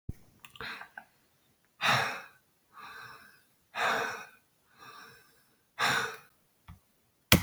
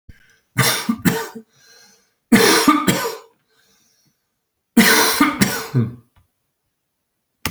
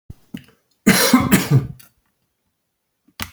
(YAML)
exhalation_length: 7.4 s
exhalation_amplitude: 30664
exhalation_signal_mean_std_ratio: 0.34
three_cough_length: 7.5 s
three_cough_amplitude: 32549
three_cough_signal_mean_std_ratio: 0.44
cough_length: 3.3 s
cough_amplitude: 32767
cough_signal_mean_std_ratio: 0.38
survey_phase: alpha (2021-03-01 to 2021-08-12)
age: 65+
gender: Male
wearing_mask: 'No'
symptom_shortness_of_breath: true
symptom_change_to_sense_of_smell_or_taste: true
symptom_onset: 12 days
smoker_status: Ex-smoker
respiratory_condition_asthma: false
respiratory_condition_other: false
recruitment_source: REACT
submission_delay: 2 days
covid_test_result: Negative
covid_test_method: RT-qPCR